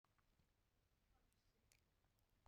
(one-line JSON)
{"exhalation_length": "2.5 s", "exhalation_amplitude": 99, "exhalation_signal_mean_std_ratio": 0.83, "survey_phase": "beta (2021-08-13 to 2022-03-07)", "age": "45-64", "gender": "Female", "wearing_mask": "No", "symptom_cough_any": true, "symptom_runny_or_blocked_nose": true, "symptom_shortness_of_breath": true, "symptom_headache": true, "symptom_change_to_sense_of_smell_or_taste": true, "symptom_loss_of_taste": true, "symptom_other": true, "symptom_onset": "3 days", "smoker_status": "Never smoked", "respiratory_condition_asthma": true, "respiratory_condition_other": false, "recruitment_source": "Test and Trace", "submission_delay": "2 days", "covid_test_result": "Positive", "covid_test_method": "RT-qPCR", "covid_ct_value": 26.9, "covid_ct_gene": "N gene"}